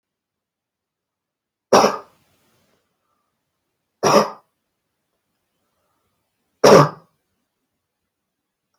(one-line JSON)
{"three_cough_length": "8.8 s", "three_cough_amplitude": 32277, "three_cough_signal_mean_std_ratio": 0.22, "survey_phase": "beta (2021-08-13 to 2022-03-07)", "age": "18-44", "gender": "Male", "wearing_mask": "No", "symptom_none": true, "smoker_status": "Never smoked", "respiratory_condition_asthma": false, "respiratory_condition_other": false, "recruitment_source": "REACT", "submission_delay": "2 days", "covid_test_result": "Negative", "covid_test_method": "RT-qPCR"}